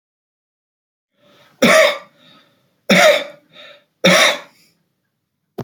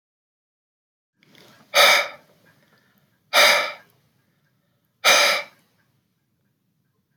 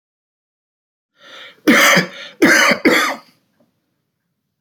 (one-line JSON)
{"three_cough_length": "5.6 s", "three_cough_amplitude": 32095, "three_cough_signal_mean_std_ratio": 0.36, "exhalation_length": "7.2 s", "exhalation_amplitude": 25115, "exhalation_signal_mean_std_ratio": 0.31, "cough_length": "4.6 s", "cough_amplitude": 32566, "cough_signal_mean_std_ratio": 0.41, "survey_phase": "beta (2021-08-13 to 2022-03-07)", "age": "45-64", "gender": "Male", "wearing_mask": "No", "symptom_none": true, "symptom_onset": "4 days", "smoker_status": "Never smoked", "respiratory_condition_asthma": false, "respiratory_condition_other": false, "recruitment_source": "REACT", "submission_delay": "2 days", "covid_test_result": "Negative", "covid_test_method": "RT-qPCR"}